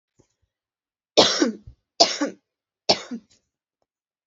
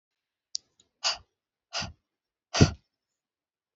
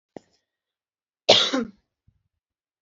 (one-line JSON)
{"three_cough_length": "4.3 s", "three_cough_amplitude": 32768, "three_cough_signal_mean_std_ratio": 0.29, "exhalation_length": "3.8 s", "exhalation_amplitude": 23412, "exhalation_signal_mean_std_ratio": 0.2, "cough_length": "2.8 s", "cough_amplitude": 29271, "cough_signal_mean_std_ratio": 0.25, "survey_phase": "beta (2021-08-13 to 2022-03-07)", "age": "18-44", "gender": "Female", "wearing_mask": "No", "symptom_none": true, "smoker_status": "Never smoked", "respiratory_condition_asthma": true, "respiratory_condition_other": false, "recruitment_source": "REACT", "submission_delay": "0 days", "covid_test_result": "Negative", "covid_test_method": "RT-qPCR"}